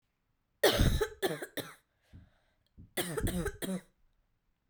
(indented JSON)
{
  "cough_length": "4.7 s",
  "cough_amplitude": 7983,
  "cough_signal_mean_std_ratio": 0.41,
  "survey_phase": "beta (2021-08-13 to 2022-03-07)",
  "age": "18-44",
  "gender": "Female",
  "wearing_mask": "No",
  "symptom_cough_any": true,
  "symptom_runny_or_blocked_nose": true,
  "symptom_onset": "7 days",
  "smoker_status": "Never smoked",
  "respiratory_condition_asthma": false,
  "respiratory_condition_other": false,
  "recruitment_source": "Test and Trace",
  "submission_delay": "3 days",
  "covid_test_result": "Positive",
  "covid_test_method": "RT-qPCR"
}